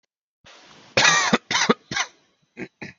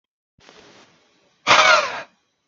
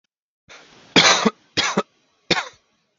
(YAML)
cough_length: 3.0 s
cough_amplitude: 28152
cough_signal_mean_std_ratio: 0.4
exhalation_length: 2.5 s
exhalation_amplitude: 29216
exhalation_signal_mean_std_ratio: 0.35
three_cough_length: 3.0 s
three_cough_amplitude: 30418
three_cough_signal_mean_std_ratio: 0.36
survey_phase: alpha (2021-03-01 to 2021-08-12)
age: 18-44
gender: Male
wearing_mask: 'No'
symptom_none: true
smoker_status: Ex-smoker
respiratory_condition_asthma: true
respiratory_condition_other: false
recruitment_source: REACT
submission_delay: 3 days
covid_test_result: Negative
covid_test_method: RT-qPCR